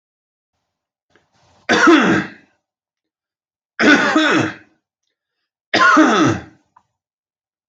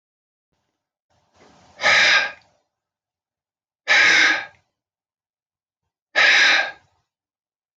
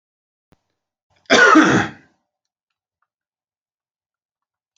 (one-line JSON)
{"three_cough_length": "7.7 s", "three_cough_amplitude": 29770, "three_cough_signal_mean_std_ratio": 0.42, "exhalation_length": "7.8 s", "exhalation_amplitude": 23664, "exhalation_signal_mean_std_ratio": 0.37, "cough_length": "4.8 s", "cough_amplitude": 27903, "cough_signal_mean_std_ratio": 0.28, "survey_phase": "beta (2021-08-13 to 2022-03-07)", "age": "45-64", "gender": "Male", "wearing_mask": "No", "symptom_sore_throat": true, "symptom_onset": "5 days", "smoker_status": "Never smoked", "respiratory_condition_asthma": false, "respiratory_condition_other": false, "recruitment_source": "REACT", "submission_delay": "2 days", "covid_test_result": "Negative", "covid_test_method": "RT-qPCR"}